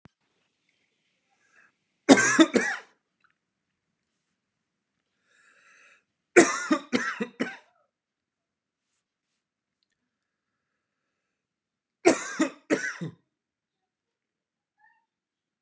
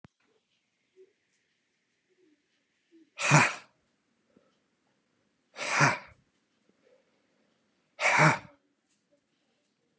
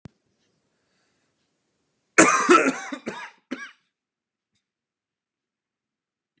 {"three_cough_length": "15.6 s", "three_cough_amplitude": 29749, "three_cough_signal_mean_std_ratio": 0.22, "exhalation_length": "10.0 s", "exhalation_amplitude": 14990, "exhalation_signal_mean_std_ratio": 0.25, "cough_length": "6.4 s", "cough_amplitude": 32742, "cough_signal_mean_std_ratio": 0.24, "survey_phase": "beta (2021-08-13 to 2022-03-07)", "age": "18-44", "gender": "Male", "wearing_mask": "No", "symptom_cough_any": true, "symptom_new_continuous_cough": true, "symptom_sore_throat": true, "symptom_fatigue": true, "symptom_onset": "3 days", "smoker_status": "Ex-smoker", "respiratory_condition_asthma": false, "respiratory_condition_other": false, "recruitment_source": "Test and Trace", "submission_delay": "1 day", "covid_test_result": "Positive", "covid_test_method": "RT-qPCR", "covid_ct_value": 28.9, "covid_ct_gene": "ORF1ab gene", "covid_ct_mean": 29.0, "covid_viral_load": "300 copies/ml", "covid_viral_load_category": "Minimal viral load (< 10K copies/ml)"}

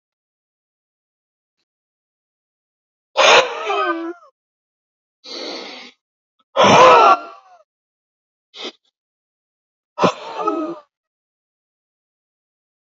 {"exhalation_length": "13.0 s", "exhalation_amplitude": 31297, "exhalation_signal_mean_std_ratio": 0.29, "survey_phase": "beta (2021-08-13 to 2022-03-07)", "age": "45-64", "gender": "Male", "wearing_mask": "No", "symptom_none": true, "smoker_status": "Never smoked", "respiratory_condition_asthma": true, "respiratory_condition_other": false, "recruitment_source": "REACT", "submission_delay": "1 day", "covid_test_result": "Negative", "covid_test_method": "RT-qPCR", "influenza_a_test_result": "Unknown/Void", "influenza_b_test_result": "Unknown/Void"}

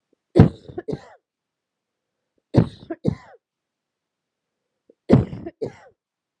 {"three_cough_length": "6.4 s", "three_cough_amplitude": 32768, "three_cough_signal_mean_std_ratio": 0.23, "survey_phase": "beta (2021-08-13 to 2022-03-07)", "age": "18-44", "gender": "Female", "wearing_mask": "No", "symptom_cough_any": true, "symptom_runny_or_blocked_nose": true, "symptom_shortness_of_breath": true, "symptom_sore_throat": true, "symptom_diarrhoea": true, "symptom_fatigue": true, "symptom_fever_high_temperature": true, "symptom_headache": true, "symptom_other": true, "symptom_onset": "6 days", "smoker_status": "Ex-smoker", "respiratory_condition_asthma": true, "respiratory_condition_other": false, "recruitment_source": "Test and Trace", "submission_delay": "2 days", "covid_test_result": "Positive", "covid_test_method": "RT-qPCR", "covid_ct_value": 17.9, "covid_ct_gene": "ORF1ab gene", "covid_ct_mean": 18.3, "covid_viral_load": "970000 copies/ml", "covid_viral_load_category": "Low viral load (10K-1M copies/ml)"}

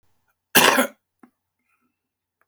{"cough_length": "2.5 s", "cough_amplitude": 32767, "cough_signal_mean_std_ratio": 0.27, "survey_phase": "beta (2021-08-13 to 2022-03-07)", "age": "65+", "gender": "Male", "wearing_mask": "No", "symptom_cough_any": true, "smoker_status": "Current smoker (11 or more cigarettes per day)", "respiratory_condition_asthma": false, "respiratory_condition_other": false, "recruitment_source": "REACT", "submission_delay": "1 day", "covid_test_result": "Negative", "covid_test_method": "RT-qPCR"}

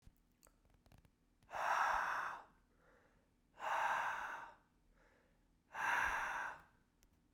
{"exhalation_length": "7.3 s", "exhalation_amplitude": 1720, "exhalation_signal_mean_std_ratio": 0.51, "survey_phase": "beta (2021-08-13 to 2022-03-07)", "age": "45-64", "gender": "Male", "wearing_mask": "No", "symptom_cough_any": true, "symptom_runny_or_blocked_nose": true, "symptom_fatigue": true, "symptom_change_to_sense_of_smell_or_taste": true, "symptom_loss_of_taste": true, "symptom_onset": "3 days", "smoker_status": "Ex-smoker", "respiratory_condition_asthma": false, "respiratory_condition_other": false, "recruitment_source": "Test and Trace", "submission_delay": "2 days", "covid_test_result": "Positive", "covid_test_method": "RT-qPCR", "covid_ct_value": 19.0, "covid_ct_gene": "ORF1ab gene", "covid_ct_mean": 19.6, "covid_viral_load": "370000 copies/ml", "covid_viral_load_category": "Low viral load (10K-1M copies/ml)"}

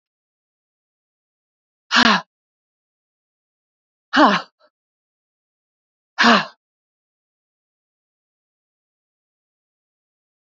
{"exhalation_length": "10.4 s", "exhalation_amplitude": 28452, "exhalation_signal_mean_std_ratio": 0.21, "survey_phase": "beta (2021-08-13 to 2022-03-07)", "age": "65+", "gender": "Female", "wearing_mask": "No", "symptom_cough_any": true, "symptom_runny_or_blocked_nose": true, "symptom_sore_throat": true, "symptom_change_to_sense_of_smell_or_taste": true, "symptom_onset": "7 days", "smoker_status": "Ex-smoker", "respiratory_condition_asthma": false, "respiratory_condition_other": true, "recruitment_source": "Test and Trace", "submission_delay": "1 day", "covid_test_result": "Positive", "covid_test_method": "RT-qPCR", "covid_ct_value": 18.2, "covid_ct_gene": "ORF1ab gene", "covid_ct_mean": 19.1, "covid_viral_load": "530000 copies/ml", "covid_viral_load_category": "Low viral load (10K-1M copies/ml)"}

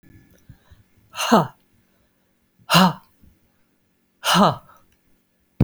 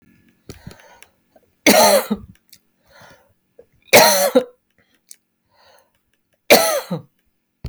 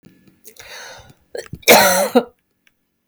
{"exhalation_length": "5.6 s", "exhalation_amplitude": 31300, "exhalation_signal_mean_std_ratio": 0.3, "three_cough_length": "7.7 s", "three_cough_amplitude": 32768, "three_cough_signal_mean_std_ratio": 0.32, "cough_length": "3.1 s", "cough_amplitude": 32768, "cough_signal_mean_std_ratio": 0.35, "survey_phase": "beta (2021-08-13 to 2022-03-07)", "age": "45-64", "gender": "Female", "wearing_mask": "No", "symptom_fatigue": true, "smoker_status": "Never smoked", "respiratory_condition_asthma": false, "respiratory_condition_other": false, "recruitment_source": "REACT", "submission_delay": "0 days", "covid_test_result": "Negative", "covid_test_method": "RT-qPCR"}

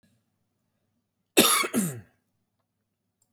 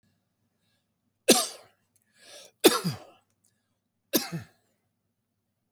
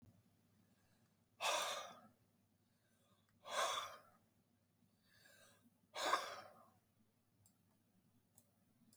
{"cough_length": "3.3 s", "cough_amplitude": 21869, "cough_signal_mean_std_ratio": 0.29, "three_cough_length": "5.7 s", "three_cough_amplitude": 21996, "three_cough_signal_mean_std_ratio": 0.22, "exhalation_length": "9.0 s", "exhalation_amplitude": 2138, "exhalation_signal_mean_std_ratio": 0.33, "survey_phase": "beta (2021-08-13 to 2022-03-07)", "age": "18-44", "gender": "Male", "wearing_mask": "No", "symptom_none": true, "smoker_status": "Never smoked", "respiratory_condition_asthma": false, "respiratory_condition_other": false, "recruitment_source": "REACT", "submission_delay": "1 day", "covid_test_result": "Negative", "covid_test_method": "RT-qPCR"}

